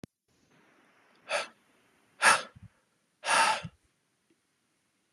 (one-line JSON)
{"exhalation_length": "5.1 s", "exhalation_amplitude": 12392, "exhalation_signal_mean_std_ratio": 0.28, "survey_phase": "beta (2021-08-13 to 2022-03-07)", "age": "18-44", "gender": "Male", "wearing_mask": "No", "symptom_headache": true, "smoker_status": "Never smoked", "respiratory_condition_asthma": false, "respiratory_condition_other": false, "recruitment_source": "Test and Trace", "submission_delay": "2 days", "covid_test_result": "Positive", "covid_test_method": "RT-qPCR", "covid_ct_value": 29.2, "covid_ct_gene": "ORF1ab gene"}